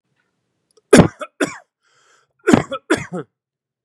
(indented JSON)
{
  "cough_length": "3.8 s",
  "cough_amplitude": 32768,
  "cough_signal_mean_std_ratio": 0.27,
  "survey_phase": "beta (2021-08-13 to 2022-03-07)",
  "age": "18-44",
  "gender": "Male",
  "wearing_mask": "No",
  "symptom_none": true,
  "smoker_status": "Never smoked",
  "respiratory_condition_asthma": false,
  "respiratory_condition_other": false,
  "recruitment_source": "REACT",
  "submission_delay": "1 day",
  "covid_test_result": "Negative",
  "covid_test_method": "RT-qPCR",
  "influenza_a_test_result": "Negative",
  "influenza_b_test_result": "Negative"
}